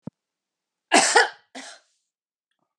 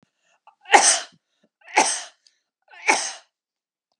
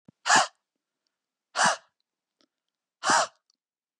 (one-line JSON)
{"cough_length": "2.8 s", "cough_amplitude": 27220, "cough_signal_mean_std_ratio": 0.28, "three_cough_length": "4.0 s", "three_cough_amplitude": 32767, "three_cough_signal_mean_std_ratio": 0.31, "exhalation_length": "4.0 s", "exhalation_amplitude": 15461, "exhalation_signal_mean_std_ratio": 0.3, "survey_phase": "beta (2021-08-13 to 2022-03-07)", "age": "45-64", "gender": "Female", "wearing_mask": "No", "symptom_none": true, "smoker_status": "Never smoked", "respiratory_condition_asthma": false, "respiratory_condition_other": false, "recruitment_source": "REACT", "submission_delay": "4 days", "covid_test_result": "Negative", "covid_test_method": "RT-qPCR", "influenza_a_test_result": "Negative", "influenza_b_test_result": "Negative"}